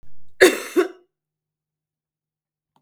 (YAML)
cough_length: 2.8 s
cough_amplitude: 32768
cough_signal_mean_std_ratio: 0.3
survey_phase: beta (2021-08-13 to 2022-03-07)
age: 45-64
gender: Female
wearing_mask: 'No'
symptom_cough_any: true
symptom_runny_or_blocked_nose: true
symptom_sore_throat: true
symptom_fatigue: true
symptom_headache: true
smoker_status: Never smoked
respiratory_condition_asthma: false
respiratory_condition_other: false
recruitment_source: Test and Trace
submission_delay: 2 days
covid_test_result: Positive
covid_test_method: RT-qPCR
covid_ct_value: 25.3
covid_ct_gene: ORF1ab gene
covid_ct_mean: 25.8
covid_viral_load: 3500 copies/ml
covid_viral_load_category: Minimal viral load (< 10K copies/ml)